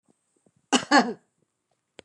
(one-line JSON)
{"cough_length": "2.0 s", "cough_amplitude": 22654, "cough_signal_mean_std_ratio": 0.27, "survey_phase": "beta (2021-08-13 to 2022-03-07)", "age": "65+", "gender": "Female", "wearing_mask": "No", "symptom_runny_or_blocked_nose": true, "symptom_onset": "12 days", "smoker_status": "Current smoker (1 to 10 cigarettes per day)", "respiratory_condition_asthma": false, "respiratory_condition_other": false, "recruitment_source": "REACT", "submission_delay": "2 days", "covid_test_result": "Negative", "covid_test_method": "RT-qPCR", "influenza_a_test_result": "Negative", "influenza_b_test_result": "Negative"}